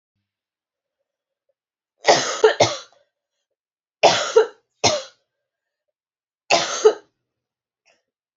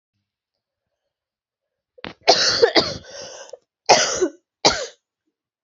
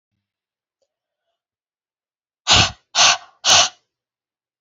three_cough_length: 8.4 s
three_cough_amplitude: 31077
three_cough_signal_mean_std_ratio: 0.3
cough_length: 5.6 s
cough_amplitude: 32767
cough_signal_mean_std_ratio: 0.34
exhalation_length: 4.6 s
exhalation_amplitude: 32767
exhalation_signal_mean_std_ratio: 0.3
survey_phase: beta (2021-08-13 to 2022-03-07)
age: 18-44
gender: Female
wearing_mask: 'No'
symptom_cough_any: true
symptom_runny_or_blocked_nose: true
symptom_fatigue: true
symptom_other: true
symptom_onset: 4 days
smoker_status: Never smoked
respiratory_condition_asthma: false
respiratory_condition_other: false
recruitment_source: Test and Trace
submission_delay: 2 days
covid_test_result: Positive
covid_test_method: RT-qPCR
covid_ct_value: 17.0
covid_ct_gene: ORF1ab gene
covid_ct_mean: 17.5
covid_viral_load: 1800000 copies/ml
covid_viral_load_category: High viral load (>1M copies/ml)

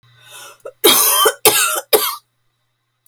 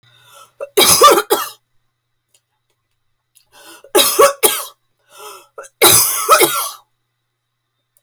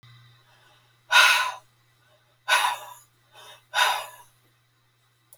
cough_length: 3.1 s
cough_amplitude: 32768
cough_signal_mean_std_ratio: 0.49
three_cough_length: 8.0 s
three_cough_amplitude: 32768
three_cough_signal_mean_std_ratio: 0.4
exhalation_length: 5.4 s
exhalation_amplitude: 21960
exhalation_signal_mean_std_ratio: 0.34
survey_phase: beta (2021-08-13 to 2022-03-07)
age: 45-64
gender: Female
wearing_mask: 'No'
symptom_cough_any: true
symptom_runny_or_blocked_nose: true
smoker_status: Never smoked
respiratory_condition_asthma: false
respiratory_condition_other: false
recruitment_source: REACT
submission_delay: 2 days
covid_test_result: Negative
covid_test_method: RT-qPCR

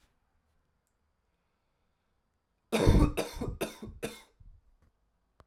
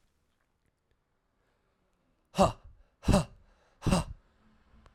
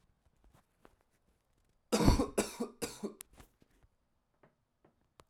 cough_length: 5.5 s
cough_amplitude: 11611
cough_signal_mean_std_ratio: 0.28
exhalation_length: 4.9 s
exhalation_amplitude: 10997
exhalation_signal_mean_std_ratio: 0.26
three_cough_length: 5.3 s
three_cough_amplitude: 8871
three_cough_signal_mean_std_ratio: 0.26
survey_phase: alpha (2021-03-01 to 2021-08-12)
age: 18-44
gender: Male
wearing_mask: 'No'
symptom_abdominal_pain: true
symptom_fever_high_temperature: true
symptom_headache: true
symptom_change_to_sense_of_smell_or_taste: true
symptom_loss_of_taste: true
symptom_onset: 6 days
smoker_status: Never smoked
respiratory_condition_asthma: false
respiratory_condition_other: false
recruitment_source: Test and Trace
submission_delay: 2 days
covid_test_result: Positive
covid_test_method: RT-qPCR
covid_ct_value: 15.8
covid_ct_gene: ORF1ab gene
covid_ct_mean: 16.9
covid_viral_load: 2900000 copies/ml
covid_viral_load_category: High viral load (>1M copies/ml)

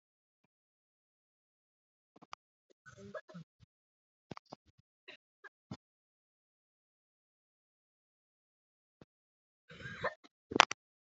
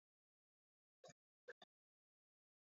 three_cough_length: 11.2 s
three_cough_amplitude: 27363
three_cough_signal_mean_std_ratio: 0.09
cough_length: 2.6 s
cough_amplitude: 154
cough_signal_mean_std_ratio: 0.17
survey_phase: alpha (2021-03-01 to 2021-08-12)
age: 18-44
gender: Female
wearing_mask: 'No'
symptom_cough_any: true
symptom_new_continuous_cough: true
symptom_shortness_of_breath: true
symptom_headache: true
symptom_onset: 7 days
smoker_status: Never smoked
respiratory_condition_asthma: true
respiratory_condition_other: false
recruitment_source: Test and Trace
submission_delay: 2 days
covid_test_result: Positive
covid_test_method: RT-qPCR
covid_ct_value: 15.9
covid_ct_gene: ORF1ab gene
covid_ct_mean: 16.3
covid_viral_load: 4600000 copies/ml
covid_viral_load_category: High viral load (>1M copies/ml)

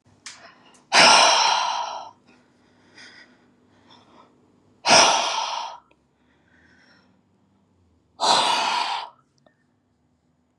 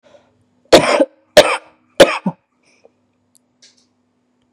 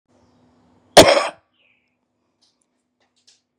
exhalation_length: 10.6 s
exhalation_amplitude: 30539
exhalation_signal_mean_std_ratio: 0.38
three_cough_length: 4.5 s
three_cough_amplitude: 32768
three_cough_signal_mean_std_ratio: 0.28
cough_length: 3.6 s
cough_amplitude: 32768
cough_signal_mean_std_ratio: 0.2
survey_phase: beta (2021-08-13 to 2022-03-07)
age: 18-44
gender: Female
wearing_mask: 'No'
symptom_none: true
symptom_onset: 11 days
smoker_status: Current smoker (11 or more cigarettes per day)
respiratory_condition_asthma: true
respiratory_condition_other: false
recruitment_source: REACT
submission_delay: 3 days
covid_test_result: Negative
covid_test_method: RT-qPCR
influenza_a_test_result: Negative
influenza_b_test_result: Negative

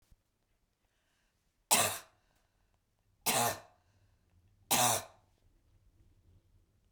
three_cough_length: 6.9 s
three_cough_amplitude: 10370
three_cough_signal_mean_std_ratio: 0.29
survey_phase: beta (2021-08-13 to 2022-03-07)
age: 45-64
gender: Female
wearing_mask: 'No'
symptom_runny_or_blocked_nose: true
smoker_status: Ex-smoker
respiratory_condition_asthma: false
respiratory_condition_other: false
recruitment_source: REACT
submission_delay: 2 days
covid_test_result: Negative
covid_test_method: RT-qPCR
influenza_a_test_result: Negative
influenza_b_test_result: Negative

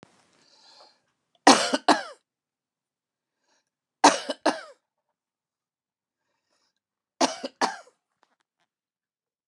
three_cough_length: 9.5 s
three_cough_amplitude: 28731
three_cough_signal_mean_std_ratio: 0.21
survey_phase: beta (2021-08-13 to 2022-03-07)
age: 45-64
gender: Female
wearing_mask: 'No'
symptom_none: true
smoker_status: Ex-smoker
respiratory_condition_asthma: false
respiratory_condition_other: false
recruitment_source: REACT
submission_delay: 2 days
covid_test_result: Negative
covid_test_method: RT-qPCR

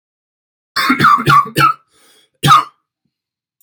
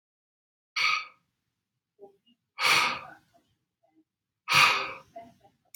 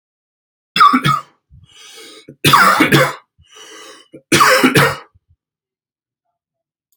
cough_length: 3.6 s
cough_amplitude: 32768
cough_signal_mean_std_ratio: 0.45
exhalation_length: 5.8 s
exhalation_amplitude: 17957
exhalation_signal_mean_std_ratio: 0.34
three_cough_length: 7.0 s
three_cough_amplitude: 32768
three_cough_signal_mean_std_ratio: 0.42
survey_phase: alpha (2021-03-01 to 2021-08-12)
age: 18-44
gender: Male
wearing_mask: 'No'
symptom_none: true
smoker_status: Never smoked
respiratory_condition_asthma: false
respiratory_condition_other: false
recruitment_source: REACT
submission_delay: 1 day
covid_test_result: Negative
covid_test_method: RT-qPCR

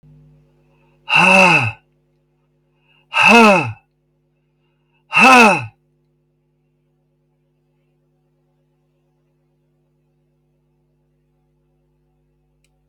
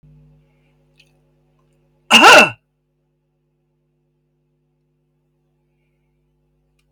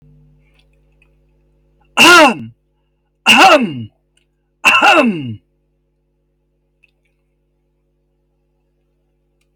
exhalation_length: 12.9 s
exhalation_amplitude: 32203
exhalation_signal_mean_std_ratio: 0.29
cough_length: 6.9 s
cough_amplitude: 32768
cough_signal_mean_std_ratio: 0.2
three_cough_length: 9.6 s
three_cough_amplitude: 32768
three_cough_signal_mean_std_ratio: 0.33
survey_phase: alpha (2021-03-01 to 2021-08-12)
age: 65+
gender: Female
wearing_mask: 'No'
symptom_none: true
smoker_status: Never smoked
respiratory_condition_asthma: false
respiratory_condition_other: false
recruitment_source: REACT
submission_delay: 6 days
covid_test_result: Negative
covid_test_method: RT-qPCR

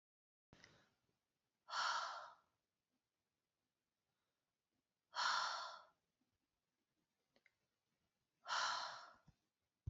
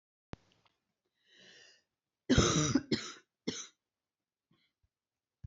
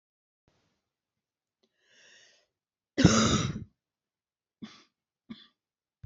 exhalation_length: 9.9 s
exhalation_amplitude: 1448
exhalation_signal_mean_std_ratio: 0.33
three_cough_length: 5.5 s
three_cough_amplitude: 6851
three_cough_signal_mean_std_ratio: 0.28
cough_length: 6.1 s
cough_amplitude: 16838
cough_signal_mean_std_ratio: 0.23
survey_phase: beta (2021-08-13 to 2022-03-07)
age: 18-44
gender: Female
wearing_mask: 'No'
symptom_cough_any: true
symptom_sore_throat: true
symptom_headache: true
smoker_status: Never smoked
respiratory_condition_asthma: false
respiratory_condition_other: false
recruitment_source: Test and Trace
submission_delay: 0 days
covid_test_result: Positive
covid_test_method: LFT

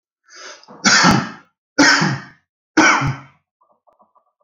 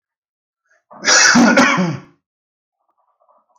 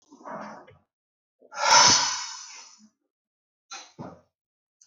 three_cough_length: 4.4 s
three_cough_amplitude: 32009
three_cough_signal_mean_std_ratio: 0.44
cough_length: 3.6 s
cough_amplitude: 32768
cough_signal_mean_std_ratio: 0.42
exhalation_length: 4.9 s
exhalation_amplitude: 21874
exhalation_signal_mean_std_ratio: 0.31
survey_phase: alpha (2021-03-01 to 2021-08-12)
age: 45-64
gender: Male
wearing_mask: 'No'
symptom_none: true
smoker_status: Ex-smoker
respiratory_condition_asthma: false
respiratory_condition_other: false
recruitment_source: REACT
submission_delay: 4 days
covid_test_result: Negative
covid_test_method: RT-qPCR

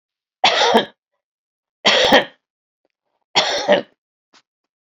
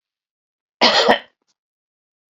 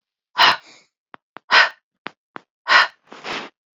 three_cough_length: 4.9 s
three_cough_amplitude: 32768
three_cough_signal_mean_std_ratio: 0.39
cough_length: 2.4 s
cough_amplitude: 32768
cough_signal_mean_std_ratio: 0.31
exhalation_length: 3.8 s
exhalation_amplitude: 32767
exhalation_signal_mean_std_ratio: 0.32
survey_phase: beta (2021-08-13 to 2022-03-07)
age: 45-64
gender: Female
wearing_mask: 'No'
symptom_none: true
smoker_status: Ex-smoker
respiratory_condition_asthma: false
respiratory_condition_other: false
recruitment_source: REACT
submission_delay: 1 day
covid_test_result: Negative
covid_test_method: RT-qPCR
influenza_a_test_result: Unknown/Void
influenza_b_test_result: Unknown/Void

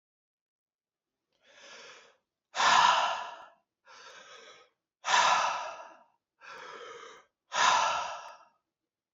exhalation_length: 9.1 s
exhalation_amplitude: 9678
exhalation_signal_mean_std_ratio: 0.39
survey_phase: beta (2021-08-13 to 2022-03-07)
age: 18-44
gender: Male
wearing_mask: 'No'
symptom_none: true
smoker_status: Never smoked
respiratory_condition_asthma: false
respiratory_condition_other: false
recruitment_source: REACT
submission_delay: 3 days
covid_test_result: Negative
covid_test_method: RT-qPCR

